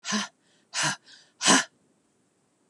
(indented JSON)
{
  "exhalation_length": "2.7 s",
  "exhalation_amplitude": 16016,
  "exhalation_signal_mean_std_ratio": 0.35,
  "survey_phase": "beta (2021-08-13 to 2022-03-07)",
  "age": "45-64",
  "gender": "Female",
  "wearing_mask": "No",
  "symptom_none": true,
  "symptom_onset": "12 days",
  "smoker_status": "Never smoked",
  "respiratory_condition_asthma": false,
  "respiratory_condition_other": false,
  "recruitment_source": "REACT",
  "submission_delay": "1 day",
  "covid_test_result": "Negative",
  "covid_test_method": "RT-qPCR",
  "influenza_a_test_result": "Negative",
  "influenza_b_test_result": "Negative"
}